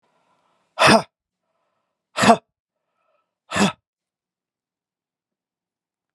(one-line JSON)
{"exhalation_length": "6.1 s", "exhalation_amplitude": 31788, "exhalation_signal_mean_std_ratio": 0.23, "survey_phase": "beta (2021-08-13 to 2022-03-07)", "age": "45-64", "gender": "Male", "wearing_mask": "No", "symptom_cough_any": true, "symptom_sore_throat": true, "symptom_headache": true, "smoker_status": "Never smoked", "respiratory_condition_asthma": false, "respiratory_condition_other": false, "recruitment_source": "REACT", "submission_delay": "2 days", "covid_test_result": "Negative", "covid_test_method": "RT-qPCR", "influenza_a_test_result": "Negative", "influenza_b_test_result": "Negative"}